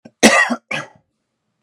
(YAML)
cough_length: 1.6 s
cough_amplitude: 32768
cough_signal_mean_std_ratio: 0.37
survey_phase: beta (2021-08-13 to 2022-03-07)
age: 45-64
gender: Male
wearing_mask: 'No'
symptom_none: true
smoker_status: Never smoked
respiratory_condition_asthma: false
respiratory_condition_other: false
recruitment_source: REACT
submission_delay: 1 day
covid_test_result: Negative
covid_test_method: RT-qPCR